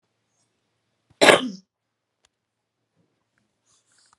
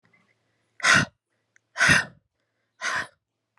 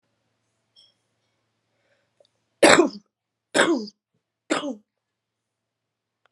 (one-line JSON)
{"cough_length": "4.2 s", "cough_amplitude": 32768, "cough_signal_mean_std_ratio": 0.17, "exhalation_length": "3.6 s", "exhalation_amplitude": 20762, "exhalation_signal_mean_std_ratio": 0.33, "three_cough_length": "6.3 s", "three_cough_amplitude": 32443, "three_cough_signal_mean_std_ratio": 0.24, "survey_phase": "beta (2021-08-13 to 2022-03-07)", "age": "18-44", "gender": "Female", "wearing_mask": "No", "symptom_cough_any": true, "symptom_new_continuous_cough": true, "symptom_headache": true, "symptom_onset": "5 days", "smoker_status": "Current smoker (11 or more cigarettes per day)", "respiratory_condition_asthma": false, "respiratory_condition_other": false, "recruitment_source": "REACT", "submission_delay": "2 days", "covid_test_result": "Negative", "covid_test_method": "RT-qPCR"}